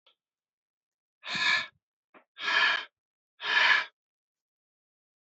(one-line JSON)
{"exhalation_length": "5.2 s", "exhalation_amplitude": 9895, "exhalation_signal_mean_std_ratio": 0.38, "survey_phase": "beta (2021-08-13 to 2022-03-07)", "age": "18-44", "gender": "Male", "wearing_mask": "No", "symptom_cough_any": true, "symptom_new_continuous_cough": true, "symptom_runny_or_blocked_nose": true, "symptom_fatigue": true, "symptom_fever_high_temperature": true, "symptom_headache": true, "symptom_loss_of_taste": true, "symptom_other": true, "symptom_onset": "5 days", "smoker_status": "Ex-smoker", "respiratory_condition_asthma": true, "respiratory_condition_other": false, "recruitment_source": "Test and Trace", "submission_delay": "2 days", "covid_test_result": "Positive", "covid_test_method": "RT-qPCR", "covid_ct_value": 17.8, "covid_ct_gene": "N gene"}